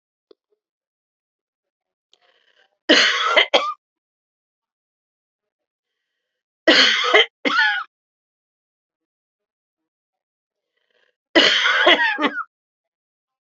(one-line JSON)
{"three_cough_length": "13.5 s", "three_cough_amplitude": 30160, "three_cough_signal_mean_std_ratio": 0.34, "survey_phase": "beta (2021-08-13 to 2022-03-07)", "age": "65+", "gender": "Female", "wearing_mask": "No", "symptom_cough_any": true, "symptom_new_continuous_cough": true, "symptom_runny_or_blocked_nose": true, "symptom_shortness_of_breath": true, "symptom_sore_throat": true, "symptom_fatigue": true, "symptom_headache": true, "smoker_status": "Ex-smoker", "respiratory_condition_asthma": false, "respiratory_condition_other": false, "recruitment_source": "Test and Trace", "submission_delay": "1 day", "covid_test_result": "Positive", "covid_test_method": "RT-qPCR", "covid_ct_value": 15.8, "covid_ct_gene": "ORF1ab gene", "covid_ct_mean": 16.1, "covid_viral_load": "5200000 copies/ml", "covid_viral_load_category": "High viral load (>1M copies/ml)"}